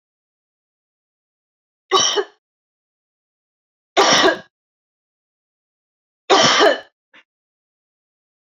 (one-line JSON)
{"three_cough_length": "8.5 s", "three_cough_amplitude": 32768, "three_cough_signal_mean_std_ratio": 0.3, "survey_phase": "beta (2021-08-13 to 2022-03-07)", "age": "65+", "gender": "Female", "wearing_mask": "No", "symptom_none": true, "smoker_status": "Ex-smoker", "respiratory_condition_asthma": false, "respiratory_condition_other": false, "recruitment_source": "REACT", "submission_delay": "2 days", "covid_test_result": "Negative", "covid_test_method": "RT-qPCR"}